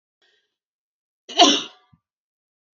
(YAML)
cough_length: 2.7 s
cough_amplitude: 30824
cough_signal_mean_std_ratio: 0.23
survey_phase: beta (2021-08-13 to 2022-03-07)
age: 18-44
gender: Female
wearing_mask: 'No'
symptom_fatigue: true
symptom_headache: true
symptom_onset: 12 days
smoker_status: Ex-smoker
respiratory_condition_asthma: false
respiratory_condition_other: false
recruitment_source: REACT
submission_delay: 1 day
covid_test_result: Negative
covid_test_method: RT-qPCR
influenza_a_test_result: Negative
influenza_b_test_result: Negative